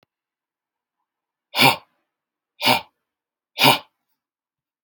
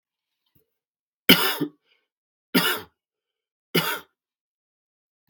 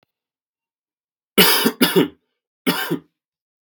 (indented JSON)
{
  "exhalation_length": "4.8 s",
  "exhalation_amplitude": 32768,
  "exhalation_signal_mean_std_ratio": 0.25,
  "three_cough_length": "5.3 s",
  "three_cough_amplitude": 32768,
  "three_cough_signal_mean_std_ratio": 0.26,
  "cough_length": "3.6 s",
  "cough_amplitude": 32768,
  "cough_signal_mean_std_ratio": 0.36,
  "survey_phase": "beta (2021-08-13 to 2022-03-07)",
  "age": "18-44",
  "gender": "Male",
  "wearing_mask": "No",
  "symptom_cough_any": true,
  "symptom_runny_or_blocked_nose": true,
  "symptom_abdominal_pain": true,
  "symptom_fatigue": true,
  "symptom_headache": true,
  "smoker_status": "Never smoked",
  "respiratory_condition_asthma": false,
  "respiratory_condition_other": false,
  "recruitment_source": "Test and Trace",
  "submission_delay": "1 day",
  "covid_test_result": "Positive",
  "covid_test_method": "RT-qPCR",
  "covid_ct_value": 15.0,
  "covid_ct_gene": "ORF1ab gene",
  "covid_ct_mean": 15.1,
  "covid_viral_load": "11000000 copies/ml",
  "covid_viral_load_category": "High viral load (>1M copies/ml)"
}